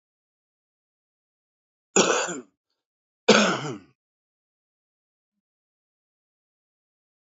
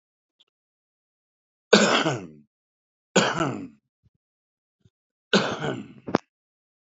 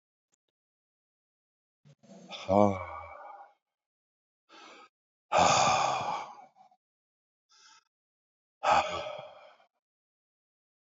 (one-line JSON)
{"cough_length": "7.3 s", "cough_amplitude": 24649, "cough_signal_mean_std_ratio": 0.23, "three_cough_length": "6.9 s", "three_cough_amplitude": 27152, "three_cough_signal_mean_std_ratio": 0.31, "exhalation_length": "10.8 s", "exhalation_amplitude": 12339, "exhalation_signal_mean_std_ratio": 0.32, "survey_phase": "alpha (2021-03-01 to 2021-08-12)", "age": "65+", "gender": "Male", "wearing_mask": "No", "symptom_none": true, "smoker_status": "Current smoker (e-cigarettes or vapes only)", "respiratory_condition_asthma": false, "respiratory_condition_other": false, "recruitment_source": "REACT", "submission_delay": "1 day", "covid_test_result": "Negative", "covid_test_method": "RT-qPCR"}